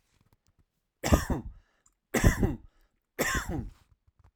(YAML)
three_cough_length: 4.4 s
three_cough_amplitude: 14238
three_cough_signal_mean_std_ratio: 0.37
survey_phase: alpha (2021-03-01 to 2021-08-12)
age: 45-64
gender: Male
wearing_mask: 'No'
symptom_none: true
smoker_status: Never smoked
respiratory_condition_asthma: false
respiratory_condition_other: false
recruitment_source: REACT
submission_delay: 1 day
covid_test_result: Negative
covid_test_method: RT-qPCR